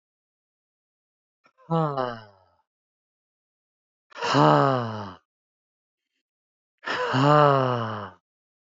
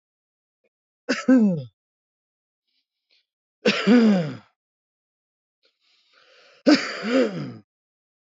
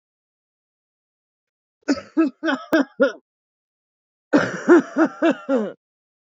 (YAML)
exhalation_length: 8.7 s
exhalation_amplitude: 22731
exhalation_signal_mean_std_ratio: 0.36
three_cough_length: 8.3 s
three_cough_amplitude: 21453
three_cough_signal_mean_std_ratio: 0.36
cough_length: 6.4 s
cough_amplitude: 23193
cough_signal_mean_std_ratio: 0.38
survey_phase: beta (2021-08-13 to 2022-03-07)
age: 18-44
gender: Male
wearing_mask: 'Yes'
symptom_none: true
symptom_onset: 3 days
smoker_status: Never smoked
respiratory_condition_asthma: true
respiratory_condition_other: false
recruitment_source: Test and Trace
submission_delay: 2 days
covid_test_result: Positive
covid_test_method: RT-qPCR
covid_ct_value: 15.8
covid_ct_gene: ORF1ab gene
covid_ct_mean: 16.2
covid_viral_load: 4900000 copies/ml
covid_viral_load_category: High viral load (>1M copies/ml)